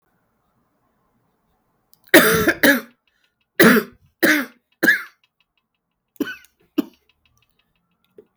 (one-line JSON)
{"three_cough_length": "8.4 s", "three_cough_amplitude": 32768, "three_cough_signal_mean_std_ratio": 0.3, "survey_phase": "beta (2021-08-13 to 2022-03-07)", "age": "45-64", "gender": "Female", "wearing_mask": "No", "symptom_cough_any": true, "symptom_runny_or_blocked_nose": true, "symptom_abdominal_pain": true, "symptom_fatigue": true, "symptom_headache": true, "symptom_change_to_sense_of_smell_or_taste": true, "symptom_onset": "3 days", "smoker_status": "Never smoked", "respiratory_condition_asthma": false, "respiratory_condition_other": false, "recruitment_source": "Test and Trace", "submission_delay": "2 days", "covid_test_result": "Positive", "covid_test_method": "RT-qPCR", "covid_ct_value": 20.8, "covid_ct_gene": "ORF1ab gene"}